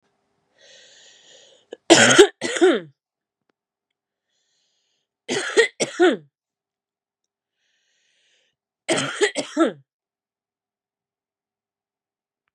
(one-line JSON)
{"three_cough_length": "12.5 s", "three_cough_amplitude": 32768, "three_cough_signal_mean_std_ratio": 0.27, "survey_phase": "beta (2021-08-13 to 2022-03-07)", "age": "45-64", "gender": "Female", "wearing_mask": "Yes", "symptom_new_continuous_cough": true, "symptom_runny_or_blocked_nose": true, "symptom_fatigue": true, "symptom_onset": "2 days", "smoker_status": "Ex-smoker", "respiratory_condition_asthma": false, "respiratory_condition_other": false, "recruitment_source": "Test and Trace", "submission_delay": "1 day", "covid_test_result": "Positive", "covid_test_method": "RT-qPCR", "covid_ct_value": 24.2, "covid_ct_gene": "N gene", "covid_ct_mean": 24.5, "covid_viral_load": "9000 copies/ml", "covid_viral_load_category": "Minimal viral load (< 10K copies/ml)"}